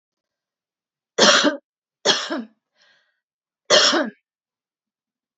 {
  "cough_length": "5.4 s",
  "cough_amplitude": 32767,
  "cough_signal_mean_std_ratio": 0.33,
  "survey_phase": "alpha (2021-03-01 to 2021-08-12)",
  "age": "65+",
  "gender": "Female",
  "wearing_mask": "No",
  "symptom_none": true,
  "symptom_onset": "9 days",
  "smoker_status": "Never smoked",
  "respiratory_condition_asthma": false,
  "respiratory_condition_other": false,
  "recruitment_source": "REACT",
  "submission_delay": "1 day",
  "covid_test_result": "Negative",
  "covid_test_method": "RT-qPCR"
}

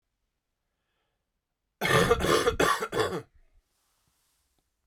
{
  "cough_length": "4.9 s",
  "cough_amplitude": 12343,
  "cough_signal_mean_std_ratio": 0.4,
  "survey_phase": "beta (2021-08-13 to 2022-03-07)",
  "age": "18-44",
  "gender": "Male",
  "wearing_mask": "No",
  "symptom_none": true,
  "smoker_status": "Never smoked",
  "respiratory_condition_asthma": false,
  "respiratory_condition_other": false,
  "recruitment_source": "Test and Trace",
  "submission_delay": "1 day",
  "covid_test_result": "Positive",
  "covid_test_method": "RT-qPCR",
  "covid_ct_value": 35.1,
  "covid_ct_gene": "ORF1ab gene"
}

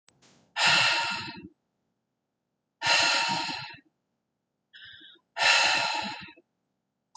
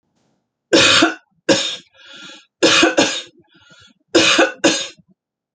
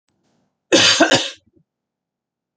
{
  "exhalation_length": "7.2 s",
  "exhalation_amplitude": 12722,
  "exhalation_signal_mean_std_ratio": 0.47,
  "three_cough_length": "5.5 s",
  "three_cough_amplitude": 31311,
  "three_cough_signal_mean_std_ratio": 0.47,
  "cough_length": "2.6 s",
  "cough_amplitude": 30548,
  "cough_signal_mean_std_ratio": 0.36,
  "survey_phase": "alpha (2021-03-01 to 2021-08-12)",
  "age": "65+",
  "gender": "Female",
  "wearing_mask": "No",
  "symptom_none": true,
  "symptom_onset": "12 days",
  "smoker_status": "Ex-smoker",
  "respiratory_condition_asthma": false,
  "respiratory_condition_other": false,
  "recruitment_source": "REACT",
  "submission_delay": "2 days",
  "covid_test_result": "Negative",
  "covid_test_method": "RT-qPCR"
}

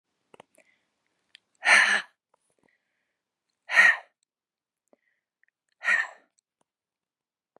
{
  "exhalation_length": "7.6 s",
  "exhalation_amplitude": 18155,
  "exhalation_signal_mean_std_ratio": 0.25,
  "survey_phase": "beta (2021-08-13 to 2022-03-07)",
  "age": "45-64",
  "gender": "Female",
  "wearing_mask": "Yes",
  "symptom_cough_any": true,
  "symptom_sore_throat": true,
  "symptom_fatigue": true,
  "symptom_headache": true,
  "smoker_status": "Never smoked",
  "respiratory_condition_asthma": false,
  "respiratory_condition_other": false,
  "recruitment_source": "Test and Trace",
  "submission_delay": "1 day",
  "covid_test_result": "Positive",
  "covid_test_method": "LFT"
}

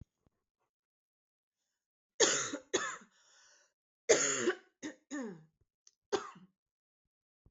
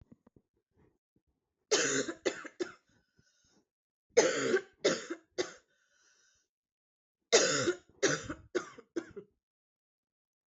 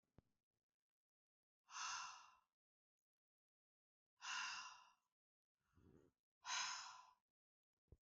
{
  "cough_length": "7.5 s",
  "cough_amplitude": 10512,
  "cough_signal_mean_std_ratio": 0.3,
  "three_cough_length": "10.5 s",
  "three_cough_amplitude": 9933,
  "three_cough_signal_mean_std_ratio": 0.34,
  "exhalation_length": "8.0 s",
  "exhalation_amplitude": 653,
  "exhalation_signal_mean_std_ratio": 0.36,
  "survey_phase": "beta (2021-08-13 to 2022-03-07)",
  "age": "45-64",
  "gender": "Female",
  "wearing_mask": "No",
  "symptom_cough_any": true,
  "symptom_runny_or_blocked_nose": true,
  "symptom_fatigue": true,
  "symptom_onset": "5 days",
  "smoker_status": "Never smoked",
  "respiratory_condition_asthma": false,
  "respiratory_condition_other": false,
  "recruitment_source": "Test and Trace",
  "submission_delay": "2 days",
  "covid_test_result": "Positive",
  "covid_test_method": "RT-qPCR",
  "covid_ct_value": 16.6,
  "covid_ct_gene": "N gene"
}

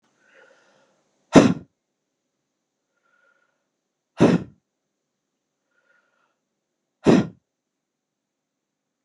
{
  "exhalation_length": "9.0 s",
  "exhalation_amplitude": 32767,
  "exhalation_signal_mean_std_ratio": 0.19,
  "survey_phase": "beta (2021-08-13 to 2022-03-07)",
  "age": "45-64",
  "gender": "Male",
  "wearing_mask": "No",
  "symptom_cough_any": true,
  "symptom_runny_or_blocked_nose": true,
  "symptom_shortness_of_breath": true,
  "smoker_status": "Ex-smoker",
  "respiratory_condition_asthma": true,
  "respiratory_condition_other": false,
  "recruitment_source": "Test and Trace",
  "submission_delay": "1 day",
  "covid_test_result": "Negative",
  "covid_test_method": "LFT"
}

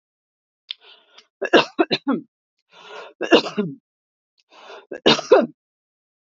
{
  "three_cough_length": "6.3 s",
  "three_cough_amplitude": 32768,
  "three_cough_signal_mean_std_ratio": 0.3,
  "survey_phase": "beta (2021-08-13 to 2022-03-07)",
  "age": "45-64",
  "gender": "Female",
  "wearing_mask": "No",
  "symptom_none": true,
  "smoker_status": "Never smoked",
  "respiratory_condition_asthma": false,
  "respiratory_condition_other": false,
  "recruitment_source": "REACT",
  "submission_delay": "2 days",
  "covid_test_result": "Negative",
  "covid_test_method": "RT-qPCR",
  "influenza_a_test_result": "Negative",
  "influenza_b_test_result": "Negative"
}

